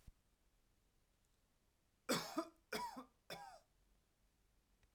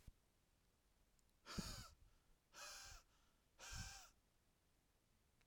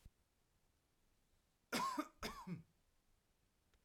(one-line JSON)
{"three_cough_length": "4.9 s", "three_cough_amplitude": 2042, "three_cough_signal_mean_std_ratio": 0.32, "exhalation_length": "5.5 s", "exhalation_amplitude": 598, "exhalation_signal_mean_std_ratio": 0.46, "cough_length": "3.8 s", "cough_amplitude": 1199, "cough_signal_mean_std_ratio": 0.35, "survey_phase": "alpha (2021-03-01 to 2021-08-12)", "age": "18-44", "gender": "Male", "wearing_mask": "No", "symptom_none": true, "smoker_status": "Never smoked", "respiratory_condition_asthma": false, "respiratory_condition_other": false, "recruitment_source": "REACT", "submission_delay": "1 day", "covid_test_result": "Negative", "covid_test_method": "RT-qPCR"}